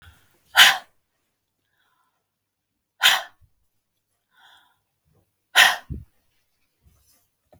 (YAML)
exhalation_length: 7.6 s
exhalation_amplitude: 32768
exhalation_signal_mean_std_ratio: 0.21
survey_phase: beta (2021-08-13 to 2022-03-07)
age: 45-64
gender: Female
wearing_mask: 'No'
symptom_runny_or_blocked_nose: true
symptom_onset: 12 days
smoker_status: Never smoked
respiratory_condition_asthma: false
respiratory_condition_other: false
recruitment_source: REACT
submission_delay: 2 days
covid_test_result: Negative
covid_test_method: RT-qPCR
influenza_a_test_result: Negative
influenza_b_test_result: Negative